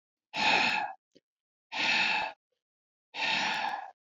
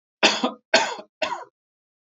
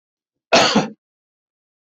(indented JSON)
{
  "exhalation_length": "4.2 s",
  "exhalation_amplitude": 7385,
  "exhalation_signal_mean_std_ratio": 0.57,
  "three_cough_length": "2.1 s",
  "three_cough_amplitude": 23856,
  "three_cough_signal_mean_std_ratio": 0.39,
  "cough_length": "1.9 s",
  "cough_amplitude": 27083,
  "cough_signal_mean_std_ratio": 0.33,
  "survey_phase": "beta (2021-08-13 to 2022-03-07)",
  "age": "45-64",
  "gender": "Male",
  "wearing_mask": "No",
  "symptom_none": true,
  "smoker_status": "Never smoked",
  "respiratory_condition_asthma": false,
  "respiratory_condition_other": false,
  "recruitment_source": "REACT",
  "submission_delay": "1 day",
  "covid_test_result": "Negative",
  "covid_test_method": "RT-qPCR",
  "influenza_a_test_result": "Negative",
  "influenza_b_test_result": "Negative"
}